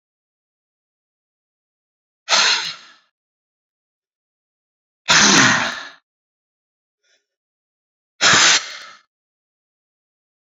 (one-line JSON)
{"exhalation_length": "10.5 s", "exhalation_amplitude": 32768, "exhalation_signal_mean_std_ratio": 0.3, "survey_phase": "beta (2021-08-13 to 2022-03-07)", "age": "45-64", "gender": "Male", "wearing_mask": "No", "symptom_none": true, "smoker_status": "Ex-smoker", "respiratory_condition_asthma": false, "respiratory_condition_other": false, "recruitment_source": "Test and Trace", "submission_delay": "1 day", "covid_test_result": "Positive", "covid_test_method": "RT-qPCR"}